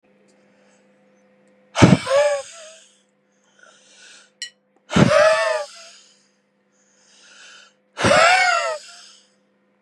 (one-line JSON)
{"exhalation_length": "9.8 s", "exhalation_amplitude": 32768, "exhalation_signal_mean_std_ratio": 0.37, "survey_phase": "beta (2021-08-13 to 2022-03-07)", "age": "45-64", "gender": "Male", "wearing_mask": "No", "symptom_none": true, "smoker_status": "Never smoked", "respiratory_condition_asthma": false, "respiratory_condition_other": false, "recruitment_source": "REACT", "submission_delay": "2 days", "covid_test_result": "Negative", "covid_test_method": "RT-qPCR", "influenza_a_test_result": "Negative", "influenza_b_test_result": "Negative"}